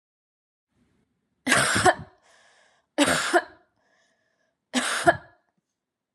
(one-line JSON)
{"three_cough_length": "6.1 s", "three_cough_amplitude": 21965, "three_cough_signal_mean_std_ratio": 0.35, "survey_phase": "beta (2021-08-13 to 2022-03-07)", "age": "18-44", "gender": "Female", "wearing_mask": "No", "symptom_none": true, "smoker_status": "Never smoked", "respiratory_condition_asthma": false, "respiratory_condition_other": false, "recruitment_source": "REACT", "submission_delay": "2 days", "covid_test_result": "Negative", "covid_test_method": "RT-qPCR", "influenza_a_test_result": "Negative", "influenza_b_test_result": "Negative"}